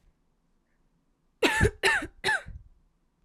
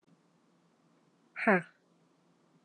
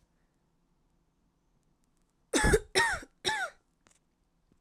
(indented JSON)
{
  "cough_length": "3.2 s",
  "cough_amplitude": 14095,
  "cough_signal_mean_std_ratio": 0.38,
  "exhalation_length": "2.6 s",
  "exhalation_amplitude": 9300,
  "exhalation_signal_mean_std_ratio": 0.21,
  "three_cough_length": "4.6 s",
  "three_cough_amplitude": 8575,
  "three_cough_signal_mean_std_ratio": 0.31,
  "survey_phase": "alpha (2021-03-01 to 2021-08-12)",
  "age": "18-44",
  "gender": "Female",
  "wearing_mask": "No",
  "symptom_cough_any": true,
  "symptom_new_continuous_cough": true,
  "symptom_abdominal_pain": true,
  "symptom_fatigue": true,
  "symptom_fever_high_temperature": true,
  "symptom_headache": true,
  "symptom_change_to_sense_of_smell_or_taste": true,
  "symptom_onset": "6 days",
  "smoker_status": "Never smoked",
  "respiratory_condition_asthma": false,
  "respiratory_condition_other": false,
  "recruitment_source": "Test and Trace",
  "submission_delay": "2 days",
  "covid_test_result": "Positive",
  "covid_test_method": "RT-qPCR",
  "covid_ct_value": 14.4,
  "covid_ct_gene": "ORF1ab gene",
  "covid_ct_mean": 14.6,
  "covid_viral_load": "16000000 copies/ml",
  "covid_viral_load_category": "High viral load (>1M copies/ml)"
}